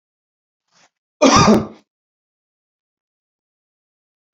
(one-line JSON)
{"cough_length": "4.4 s", "cough_amplitude": 31306, "cough_signal_mean_std_ratio": 0.25, "survey_phase": "beta (2021-08-13 to 2022-03-07)", "age": "45-64", "gender": "Male", "wearing_mask": "No", "symptom_none": true, "smoker_status": "Never smoked", "respiratory_condition_asthma": false, "respiratory_condition_other": false, "recruitment_source": "REACT", "submission_delay": "1 day", "covid_test_result": "Negative", "covid_test_method": "RT-qPCR"}